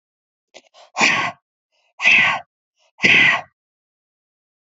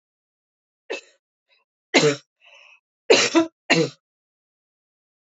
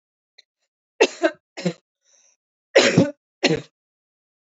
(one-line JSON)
{"exhalation_length": "4.6 s", "exhalation_amplitude": 27360, "exhalation_signal_mean_std_ratio": 0.39, "three_cough_length": "5.3 s", "three_cough_amplitude": 26216, "three_cough_signal_mean_std_ratio": 0.29, "cough_length": "4.5 s", "cough_amplitude": 29306, "cough_signal_mean_std_ratio": 0.3, "survey_phase": "alpha (2021-03-01 to 2021-08-12)", "age": "18-44", "gender": "Female", "wearing_mask": "No", "symptom_none": true, "smoker_status": "Never smoked", "respiratory_condition_asthma": false, "respiratory_condition_other": false, "recruitment_source": "REACT", "submission_delay": "1 day", "covid_test_result": "Negative", "covid_test_method": "RT-qPCR"}